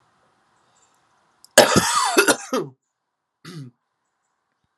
{"cough_length": "4.8 s", "cough_amplitude": 32768, "cough_signal_mean_std_ratio": 0.32, "survey_phase": "alpha (2021-03-01 to 2021-08-12)", "age": "18-44", "gender": "Male", "wearing_mask": "No", "symptom_cough_any": true, "symptom_fatigue": true, "symptom_headache": true, "symptom_onset": "4 days", "smoker_status": "Never smoked", "respiratory_condition_asthma": false, "respiratory_condition_other": false, "recruitment_source": "Test and Trace", "submission_delay": "2 days", "covid_test_result": "Positive", "covid_test_method": "RT-qPCR"}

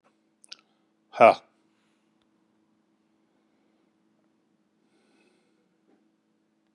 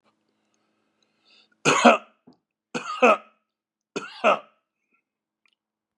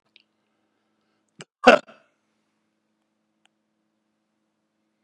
{"exhalation_length": "6.7 s", "exhalation_amplitude": 27050, "exhalation_signal_mean_std_ratio": 0.12, "three_cough_length": "6.0 s", "three_cough_amplitude": 30592, "three_cough_signal_mean_std_ratio": 0.27, "cough_length": "5.0 s", "cough_amplitude": 32767, "cough_signal_mean_std_ratio": 0.12, "survey_phase": "beta (2021-08-13 to 2022-03-07)", "age": "65+", "gender": "Male", "wearing_mask": "No", "symptom_none": true, "smoker_status": "Ex-smoker", "respiratory_condition_asthma": false, "respiratory_condition_other": false, "recruitment_source": "REACT", "submission_delay": "2 days", "covid_test_result": "Negative", "covid_test_method": "RT-qPCR", "influenza_a_test_result": "Negative", "influenza_b_test_result": "Negative"}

